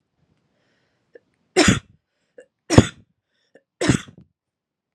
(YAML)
three_cough_length: 4.9 s
three_cough_amplitude: 32768
three_cough_signal_mean_std_ratio: 0.22
survey_phase: alpha (2021-03-01 to 2021-08-12)
age: 18-44
gender: Female
wearing_mask: 'No'
symptom_none: true
smoker_status: Never smoked
respiratory_condition_asthma: true
respiratory_condition_other: false
recruitment_source: REACT
submission_delay: 1 day
covid_test_result: Negative
covid_test_method: RT-qPCR